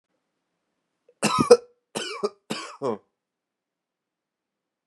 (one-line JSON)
{"three_cough_length": "4.9 s", "three_cough_amplitude": 32346, "three_cough_signal_mean_std_ratio": 0.24, "survey_phase": "beta (2021-08-13 to 2022-03-07)", "age": "18-44", "gender": "Male", "wearing_mask": "No", "symptom_cough_any": true, "symptom_runny_or_blocked_nose": true, "symptom_sore_throat": true, "symptom_headache": true, "symptom_change_to_sense_of_smell_or_taste": true, "smoker_status": "Ex-smoker", "respiratory_condition_asthma": false, "respiratory_condition_other": false, "recruitment_source": "Test and Trace", "submission_delay": "2 days", "covid_test_result": "Positive", "covid_test_method": "LFT"}